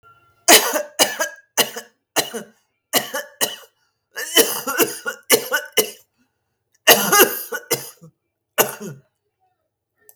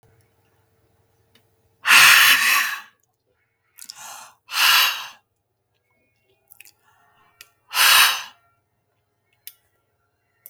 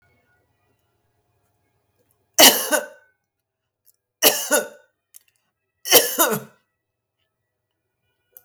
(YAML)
cough_length: 10.2 s
cough_amplitude: 32768
cough_signal_mean_std_ratio: 0.38
exhalation_length: 10.5 s
exhalation_amplitude: 32768
exhalation_signal_mean_std_ratio: 0.33
three_cough_length: 8.4 s
three_cough_amplitude: 32768
three_cough_signal_mean_std_ratio: 0.26
survey_phase: beta (2021-08-13 to 2022-03-07)
age: 45-64
gender: Female
wearing_mask: 'No'
symptom_runny_or_blocked_nose: true
symptom_fatigue: true
symptom_change_to_sense_of_smell_or_taste: true
symptom_loss_of_taste: true
symptom_onset: 13 days
smoker_status: Never smoked
respiratory_condition_asthma: false
respiratory_condition_other: false
recruitment_source: REACT
submission_delay: 8 days
covid_test_result: Negative
covid_test_method: RT-qPCR
influenza_a_test_result: Unknown/Void
influenza_b_test_result: Unknown/Void